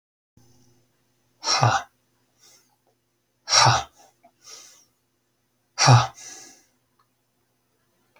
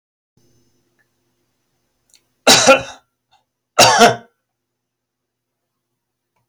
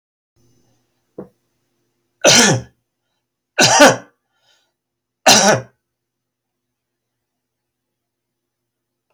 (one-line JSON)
{"exhalation_length": "8.2 s", "exhalation_amplitude": 27874, "exhalation_signal_mean_std_ratio": 0.27, "cough_length": "6.5 s", "cough_amplitude": 32768, "cough_signal_mean_std_ratio": 0.26, "three_cough_length": "9.1 s", "three_cough_amplitude": 32768, "three_cough_signal_mean_std_ratio": 0.28, "survey_phase": "alpha (2021-03-01 to 2021-08-12)", "age": "65+", "gender": "Male", "wearing_mask": "No", "symptom_none": true, "smoker_status": "Never smoked", "respiratory_condition_asthma": false, "respiratory_condition_other": false, "recruitment_source": "REACT", "submission_delay": "1 day", "covid_test_result": "Negative", "covid_test_method": "RT-qPCR"}